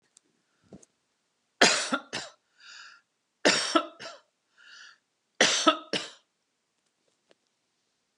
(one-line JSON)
{"three_cough_length": "8.2 s", "three_cough_amplitude": 29203, "three_cough_signal_mean_std_ratio": 0.29, "survey_phase": "beta (2021-08-13 to 2022-03-07)", "age": "45-64", "gender": "Female", "wearing_mask": "No", "symptom_runny_or_blocked_nose": true, "smoker_status": "Never smoked", "respiratory_condition_asthma": false, "respiratory_condition_other": false, "recruitment_source": "REACT", "submission_delay": "1 day", "covid_test_result": "Negative", "covid_test_method": "RT-qPCR", "influenza_a_test_result": "Unknown/Void", "influenza_b_test_result": "Unknown/Void"}